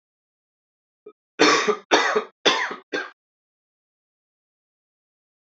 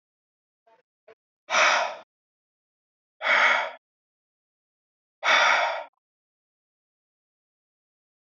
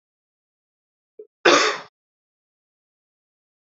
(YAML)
three_cough_length: 5.5 s
three_cough_amplitude: 26667
three_cough_signal_mean_std_ratio: 0.32
exhalation_length: 8.4 s
exhalation_amplitude: 14854
exhalation_signal_mean_std_ratio: 0.33
cough_length: 3.8 s
cough_amplitude: 27355
cough_signal_mean_std_ratio: 0.22
survey_phase: alpha (2021-03-01 to 2021-08-12)
age: 18-44
gender: Male
wearing_mask: 'No'
symptom_cough_any: true
symptom_fatigue: true
symptom_headache: true
symptom_change_to_sense_of_smell_or_taste: true
smoker_status: Ex-smoker
respiratory_condition_asthma: false
respiratory_condition_other: false
recruitment_source: Test and Trace
submission_delay: 1 day
covid_test_result: Positive
covid_test_method: RT-qPCR
covid_ct_value: 35.7
covid_ct_gene: N gene